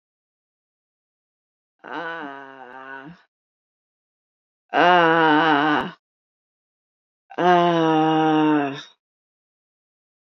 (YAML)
exhalation_length: 10.3 s
exhalation_amplitude: 27019
exhalation_signal_mean_std_ratio: 0.41
survey_phase: beta (2021-08-13 to 2022-03-07)
age: 45-64
gender: Female
wearing_mask: 'No'
symptom_cough_any: true
symptom_runny_or_blocked_nose: true
symptom_shortness_of_breath: true
symptom_sore_throat: true
symptom_abdominal_pain: true
symptom_fatigue: true
symptom_fever_high_temperature: true
symptom_headache: true
symptom_change_to_sense_of_smell_or_taste: true
symptom_other: true
smoker_status: Never smoked
respiratory_condition_asthma: false
respiratory_condition_other: false
recruitment_source: Test and Trace
submission_delay: 1 day
covid_test_result: Positive
covid_test_method: RT-qPCR
covid_ct_value: 26.7
covid_ct_gene: S gene
covid_ct_mean: 27.1
covid_viral_load: 1300 copies/ml
covid_viral_load_category: Minimal viral load (< 10K copies/ml)